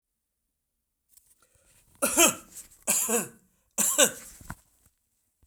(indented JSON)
{
  "cough_length": "5.5 s",
  "cough_amplitude": 22423,
  "cough_signal_mean_std_ratio": 0.33,
  "survey_phase": "beta (2021-08-13 to 2022-03-07)",
  "age": "65+",
  "gender": "Male",
  "wearing_mask": "No",
  "symptom_none": true,
  "smoker_status": "Ex-smoker",
  "respiratory_condition_asthma": false,
  "respiratory_condition_other": false,
  "recruitment_source": "REACT",
  "submission_delay": "2 days",
  "covid_test_result": "Negative",
  "covid_test_method": "RT-qPCR",
  "influenza_a_test_result": "Negative",
  "influenza_b_test_result": "Negative"
}